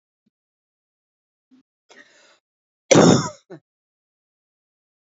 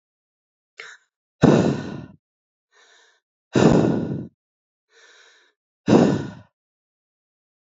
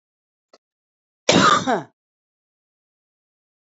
{"three_cough_length": "5.1 s", "three_cough_amplitude": 28938, "three_cough_signal_mean_std_ratio": 0.21, "exhalation_length": "7.8 s", "exhalation_amplitude": 26347, "exhalation_signal_mean_std_ratio": 0.33, "cough_length": "3.7 s", "cough_amplitude": 28762, "cough_signal_mean_std_ratio": 0.28, "survey_phase": "beta (2021-08-13 to 2022-03-07)", "age": "45-64", "gender": "Female", "wearing_mask": "No", "symptom_cough_any": true, "symptom_sore_throat": true, "symptom_diarrhoea": true, "symptom_fatigue": true, "smoker_status": "Never smoked", "respiratory_condition_asthma": false, "respiratory_condition_other": false, "recruitment_source": "Test and Trace", "submission_delay": "1 day", "covid_test_result": "Positive", "covid_test_method": "RT-qPCR", "covid_ct_value": 21.5, "covid_ct_gene": "ORF1ab gene", "covid_ct_mean": 21.6, "covid_viral_load": "84000 copies/ml", "covid_viral_load_category": "Low viral load (10K-1M copies/ml)"}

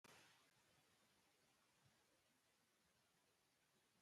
{"three_cough_length": "4.0 s", "three_cough_amplitude": 56, "three_cough_signal_mean_std_ratio": 0.79, "survey_phase": "beta (2021-08-13 to 2022-03-07)", "age": "65+", "gender": "Male", "wearing_mask": "No", "symptom_none": true, "smoker_status": "Never smoked", "respiratory_condition_asthma": false, "respiratory_condition_other": false, "recruitment_source": "REACT", "submission_delay": "3 days", "covid_test_result": "Negative", "covid_test_method": "RT-qPCR"}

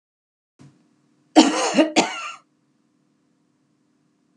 {"cough_length": "4.4 s", "cough_amplitude": 32767, "cough_signal_mean_std_ratio": 0.29, "survey_phase": "beta (2021-08-13 to 2022-03-07)", "age": "45-64", "gender": "Female", "wearing_mask": "No", "symptom_none": true, "smoker_status": "Never smoked", "respiratory_condition_asthma": false, "respiratory_condition_other": false, "recruitment_source": "REACT", "submission_delay": "1 day", "covid_test_result": "Negative", "covid_test_method": "RT-qPCR"}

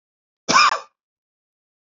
{"cough_length": "1.9 s", "cough_amplitude": 28501, "cough_signal_mean_std_ratio": 0.3, "survey_phase": "beta (2021-08-13 to 2022-03-07)", "age": "45-64", "gender": "Male", "wearing_mask": "No", "symptom_none": true, "smoker_status": "Never smoked", "respiratory_condition_asthma": false, "respiratory_condition_other": false, "recruitment_source": "REACT", "submission_delay": "1 day", "covid_test_result": "Negative", "covid_test_method": "RT-qPCR", "influenza_a_test_result": "Negative", "influenza_b_test_result": "Negative"}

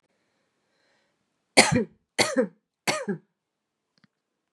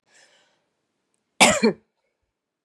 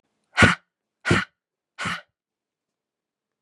{"three_cough_length": "4.5 s", "three_cough_amplitude": 30145, "three_cough_signal_mean_std_ratio": 0.28, "cough_length": "2.6 s", "cough_amplitude": 31290, "cough_signal_mean_std_ratio": 0.25, "exhalation_length": "3.4 s", "exhalation_amplitude": 29507, "exhalation_signal_mean_std_ratio": 0.26, "survey_phase": "beta (2021-08-13 to 2022-03-07)", "age": "45-64", "gender": "Female", "wearing_mask": "No", "symptom_sore_throat": true, "symptom_onset": "12 days", "smoker_status": "Current smoker (1 to 10 cigarettes per day)", "respiratory_condition_asthma": false, "respiratory_condition_other": false, "recruitment_source": "REACT", "submission_delay": "1 day", "covid_test_result": "Negative", "covid_test_method": "RT-qPCR", "influenza_a_test_result": "Negative", "influenza_b_test_result": "Negative"}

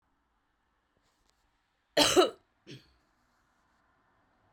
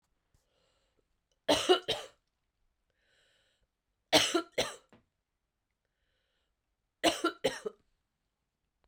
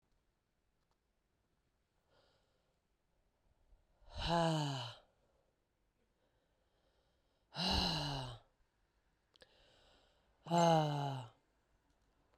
{"cough_length": "4.5 s", "cough_amplitude": 11369, "cough_signal_mean_std_ratio": 0.21, "three_cough_length": "8.9 s", "three_cough_amplitude": 9952, "three_cough_signal_mean_std_ratio": 0.26, "exhalation_length": "12.4 s", "exhalation_amplitude": 3141, "exhalation_signal_mean_std_ratio": 0.33, "survey_phase": "beta (2021-08-13 to 2022-03-07)", "age": "45-64", "gender": "Female", "wearing_mask": "No", "symptom_cough_any": true, "symptom_runny_or_blocked_nose": true, "symptom_headache": true, "smoker_status": "Never smoked", "respiratory_condition_asthma": false, "respiratory_condition_other": false, "recruitment_source": "Test and Trace", "submission_delay": "0 days", "covid_test_result": "Positive", "covid_test_method": "LFT"}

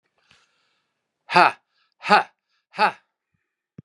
{"exhalation_length": "3.8 s", "exhalation_amplitude": 32496, "exhalation_signal_mean_std_ratio": 0.24, "survey_phase": "beta (2021-08-13 to 2022-03-07)", "age": "65+", "gender": "Male", "wearing_mask": "No", "symptom_none": true, "smoker_status": "Ex-smoker", "respiratory_condition_asthma": false, "respiratory_condition_other": false, "recruitment_source": "REACT", "submission_delay": "2 days", "covid_test_result": "Negative", "covid_test_method": "RT-qPCR", "influenza_a_test_result": "Negative", "influenza_b_test_result": "Negative"}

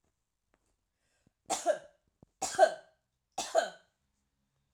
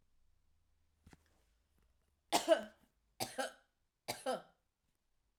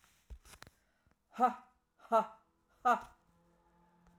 {"three_cough_length": "4.7 s", "three_cough_amplitude": 8578, "three_cough_signal_mean_std_ratio": 0.26, "cough_length": "5.4 s", "cough_amplitude": 4668, "cough_signal_mean_std_ratio": 0.25, "exhalation_length": "4.2 s", "exhalation_amplitude": 4982, "exhalation_signal_mean_std_ratio": 0.26, "survey_phase": "alpha (2021-03-01 to 2021-08-12)", "age": "45-64", "gender": "Female", "wearing_mask": "No", "symptom_headache": true, "smoker_status": "Never smoked", "respiratory_condition_asthma": false, "respiratory_condition_other": false, "recruitment_source": "REACT", "submission_delay": "2 days", "covid_test_result": "Negative", "covid_test_method": "RT-qPCR"}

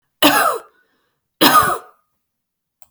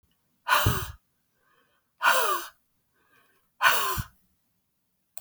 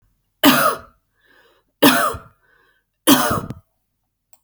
{"cough_length": "2.9 s", "cough_amplitude": 32768, "cough_signal_mean_std_ratio": 0.4, "exhalation_length": "5.2 s", "exhalation_amplitude": 18888, "exhalation_signal_mean_std_ratio": 0.39, "three_cough_length": "4.4 s", "three_cough_amplitude": 32768, "three_cough_signal_mean_std_ratio": 0.37, "survey_phase": "alpha (2021-03-01 to 2021-08-12)", "age": "45-64", "gender": "Female", "wearing_mask": "No", "symptom_none": true, "smoker_status": "Ex-smoker", "respiratory_condition_asthma": false, "respiratory_condition_other": false, "recruitment_source": "REACT", "submission_delay": "1 day", "covid_test_result": "Negative", "covid_test_method": "RT-qPCR"}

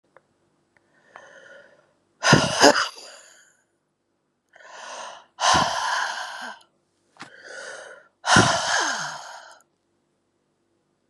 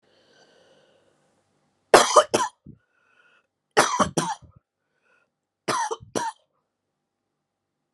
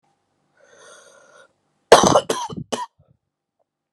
{"exhalation_length": "11.1 s", "exhalation_amplitude": 32082, "exhalation_signal_mean_std_ratio": 0.36, "three_cough_length": "7.9 s", "three_cough_amplitude": 32767, "three_cough_signal_mean_std_ratio": 0.26, "cough_length": "3.9 s", "cough_amplitude": 32768, "cough_signal_mean_std_ratio": 0.25, "survey_phase": "beta (2021-08-13 to 2022-03-07)", "age": "45-64", "gender": "Female", "wearing_mask": "No", "symptom_cough_any": true, "symptom_runny_or_blocked_nose": true, "symptom_shortness_of_breath": true, "symptom_fatigue": true, "symptom_fever_high_temperature": true, "symptom_other": true, "symptom_onset": "7 days", "smoker_status": "Never smoked", "respiratory_condition_asthma": false, "respiratory_condition_other": false, "recruitment_source": "Test and Trace", "submission_delay": "2 days", "covid_test_result": "Positive", "covid_test_method": "RT-qPCR", "covid_ct_value": 19.4, "covid_ct_gene": "ORF1ab gene", "covid_ct_mean": 23.1, "covid_viral_load": "26000 copies/ml", "covid_viral_load_category": "Low viral load (10K-1M copies/ml)"}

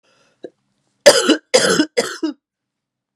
{"three_cough_length": "3.2 s", "three_cough_amplitude": 32768, "three_cough_signal_mean_std_ratio": 0.37, "survey_phase": "beta (2021-08-13 to 2022-03-07)", "age": "18-44", "gender": "Female", "wearing_mask": "No", "symptom_cough_any": true, "symptom_runny_or_blocked_nose": true, "symptom_onset": "2 days", "smoker_status": "Never smoked", "respiratory_condition_asthma": false, "respiratory_condition_other": false, "recruitment_source": "Test and Trace", "submission_delay": "1 day", "covid_test_result": "Positive", "covid_test_method": "LAMP"}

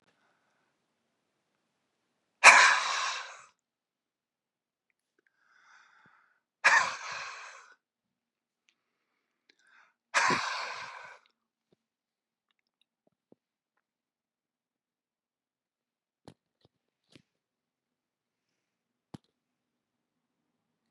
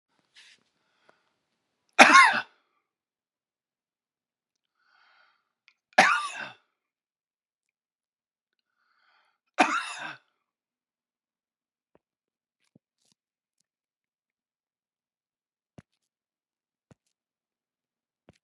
{"exhalation_length": "20.9 s", "exhalation_amplitude": 28179, "exhalation_signal_mean_std_ratio": 0.18, "three_cough_length": "18.4 s", "three_cough_amplitude": 32768, "three_cough_signal_mean_std_ratio": 0.16, "survey_phase": "beta (2021-08-13 to 2022-03-07)", "age": "65+", "gender": "Male", "wearing_mask": "No", "symptom_none": true, "smoker_status": "Ex-smoker", "respiratory_condition_asthma": true, "respiratory_condition_other": false, "recruitment_source": "REACT", "submission_delay": "2 days", "covid_test_result": "Negative", "covid_test_method": "RT-qPCR", "influenza_a_test_result": "Negative", "influenza_b_test_result": "Negative"}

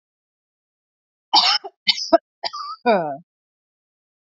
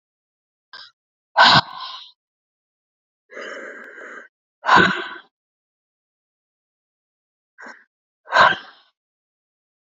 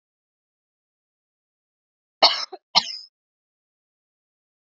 {"three_cough_length": "4.4 s", "three_cough_amplitude": 32768, "three_cough_signal_mean_std_ratio": 0.33, "exhalation_length": "9.9 s", "exhalation_amplitude": 30288, "exhalation_signal_mean_std_ratio": 0.26, "cough_length": "4.8 s", "cough_amplitude": 31054, "cough_signal_mean_std_ratio": 0.17, "survey_phase": "beta (2021-08-13 to 2022-03-07)", "age": "18-44", "gender": "Female", "wearing_mask": "No", "symptom_cough_any": true, "symptom_runny_or_blocked_nose": true, "symptom_sore_throat": true, "symptom_onset": "4 days", "smoker_status": "Current smoker (1 to 10 cigarettes per day)", "respiratory_condition_asthma": false, "respiratory_condition_other": false, "recruitment_source": "REACT", "submission_delay": "1 day", "covid_test_result": "Negative", "covid_test_method": "RT-qPCR", "influenza_a_test_result": "Negative", "influenza_b_test_result": "Negative"}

